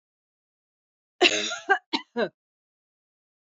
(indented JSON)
{
  "cough_length": "3.5 s",
  "cough_amplitude": 22377,
  "cough_signal_mean_std_ratio": 0.29,
  "survey_phase": "beta (2021-08-13 to 2022-03-07)",
  "age": "45-64",
  "gender": "Female",
  "wearing_mask": "No",
  "symptom_none": true,
  "smoker_status": "Never smoked",
  "respiratory_condition_asthma": true,
  "respiratory_condition_other": false,
  "recruitment_source": "REACT",
  "submission_delay": "3 days",
  "covid_test_result": "Negative",
  "covid_test_method": "RT-qPCR",
  "influenza_a_test_result": "Negative",
  "influenza_b_test_result": "Negative"
}